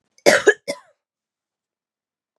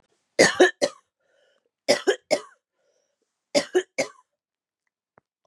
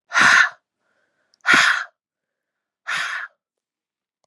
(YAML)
cough_length: 2.4 s
cough_amplitude: 32768
cough_signal_mean_std_ratio: 0.24
three_cough_length: 5.5 s
three_cough_amplitude: 27845
three_cough_signal_mean_std_ratio: 0.28
exhalation_length: 4.3 s
exhalation_amplitude: 30643
exhalation_signal_mean_std_ratio: 0.37
survey_phase: beta (2021-08-13 to 2022-03-07)
age: 45-64
gender: Female
wearing_mask: 'No'
symptom_cough_any: true
symptom_new_continuous_cough: true
symptom_runny_or_blocked_nose: true
symptom_fatigue: true
symptom_fever_high_temperature: true
symptom_headache: true
symptom_onset: 3 days
smoker_status: Ex-smoker
respiratory_condition_asthma: false
respiratory_condition_other: false
recruitment_source: Test and Trace
submission_delay: 2 days
covid_test_result: Positive
covid_test_method: RT-qPCR
covid_ct_value: 21.6
covid_ct_gene: N gene
covid_ct_mean: 22.5
covid_viral_load: 42000 copies/ml
covid_viral_load_category: Low viral load (10K-1M copies/ml)